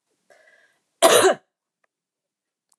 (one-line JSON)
{"cough_length": "2.8 s", "cough_amplitude": 30322, "cough_signal_mean_std_ratio": 0.27, "survey_phase": "alpha (2021-03-01 to 2021-08-12)", "age": "45-64", "gender": "Female", "wearing_mask": "No", "symptom_none": true, "smoker_status": "Never smoked", "respiratory_condition_asthma": false, "respiratory_condition_other": false, "recruitment_source": "REACT", "submission_delay": "2 days", "covid_test_result": "Negative", "covid_test_method": "RT-qPCR"}